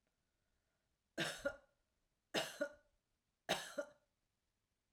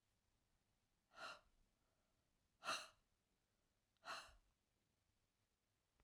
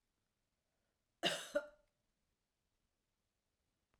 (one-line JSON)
{"three_cough_length": "4.9 s", "three_cough_amplitude": 2025, "three_cough_signal_mean_std_ratio": 0.32, "exhalation_length": "6.0 s", "exhalation_amplitude": 741, "exhalation_signal_mean_std_ratio": 0.27, "cough_length": "4.0 s", "cough_amplitude": 2511, "cough_signal_mean_std_ratio": 0.21, "survey_phase": "alpha (2021-03-01 to 2021-08-12)", "age": "65+", "gender": "Female", "wearing_mask": "No", "symptom_none": true, "smoker_status": "Ex-smoker", "respiratory_condition_asthma": false, "respiratory_condition_other": false, "recruitment_source": "REACT", "submission_delay": "2 days", "covid_test_result": "Negative", "covid_test_method": "RT-qPCR"}